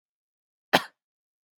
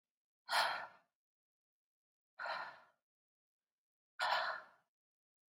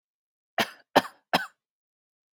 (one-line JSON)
{"cough_length": "1.6 s", "cough_amplitude": 27637, "cough_signal_mean_std_ratio": 0.15, "exhalation_length": "5.5 s", "exhalation_amplitude": 2427, "exhalation_signal_mean_std_ratio": 0.34, "three_cough_length": "2.3 s", "three_cough_amplitude": 22353, "three_cough_signal_mean_std_ratio": 0.22, "survey_phase": "beta (2021-08-13 to 2022-03-07)", "age": "18-44", "gender": "Female", "wearing_mask": "No", "symptom_none": true, "smoker_status": "Never smoked", "respiratory_condition_asthma": false, "respiratory_condition_other": false, "recruitment_source": "REACT", "submission_delay": "1 day", "covid_test_result": "Negative", "covid_test_method": "RT-qPCR", "influenza_a_test_result": "Negative", "influenza_b_test_result": "Negative"}